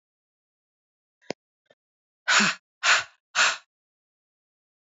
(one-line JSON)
{"exhalation_length": "4.9 s", "exhalation_amplitude": 15708, "exhalation_signal_mean_std_ratio": 0.29, "survey_phase": "beta (2021-08-13 to 2022-03-07)", "age": "45-64", "gender": "Female", "wearing_mask": "No", "symptom_cough_any": true, "symptom_runny_or_blocked_nose": true, "symptom_shortness_of_breath": true, "symptom_abdominal_pain": true, "symptom_diarrhoea": true, "symptom_fatigue": true, "symptom_other": true, "symptom_onset": "5 days", "smoker_status": "Ex-smoker", "respiratory_condition_asthma": false, "respiratory_condition_other": false, "recruitment_source": "Test and Trace", "submission_delay": "2 days", "covid_test_result": "Positive", "covid_test_method": "RT-qPCR", "covid_ct_value": 27.2, "covid_ct_gene": "ORF1ab gene", "covid_ct_mean": 27.6, "covid_viral_load": "880 copies/ml", "covid_viral_load_category": "Minimal viral load (< 10K copies/ml)"}